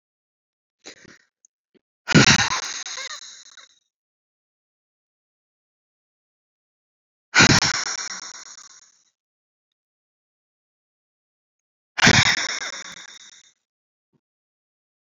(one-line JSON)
{"exhalation_length": "15.2 s", "exhalation_amplitude": 30153, "exhalation_signal_mean_std_ratio": 0.26, "survey_phase": "beta (2021-08-13 to 2022-03-07)", "age": "45-64", "gender": "Female", "wearing_mask": "No", "symptom_cough_any": true, "symptom_runny_or_blocked_nose": true, "symptom_sore_throat": true, "symptom_fatigue": true, "smoker_status": "Never smoked", "respiratory_condition_asthma": true, "respiratory_condition_other": false, "recruitment_source": "Test and Trace", "submission_delay": "1 day", "covid_test_result": "Positive", "covid_test_method": "RT-qPCR", "covid_ct_value": 27.4, "covid_ct_gene": "ORF1ab gene"}